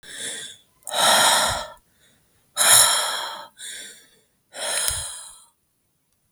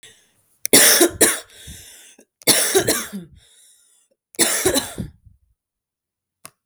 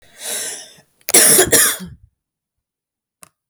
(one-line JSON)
{"exhalation_length": "6.3 s", "exhalation_amplitude": 32766, "exhalation_signal_mean_std_ratio": 0.46, "three_cough_length": "6.7 s", "three_cough_amplitude": 32768, "three_cough_signal_mean_std_ratio": 0.39, "cough_length": "3.5 s", "cough_amplitude": 32768, "cough_signal_mean_std_ratio": 0.39, "survey_phase": "beta (2021-08-13 to 2022-03-07)", "age": "18-44", "gender": "Female", "wearing_mask": "No", "symptom_cough_any": true, "smoker_status": "Never smoked", "respiratory_condition_asthma": true, "respiratory_condition_other": false, "recruitment_source": "REACT", "submission_delay": "1 day", "covid_test_result": "Negative", "covid_test_method": "RT-qPCR", "influenza_a_test_result": "Negative", "influenza_b_test_result": "Negative"}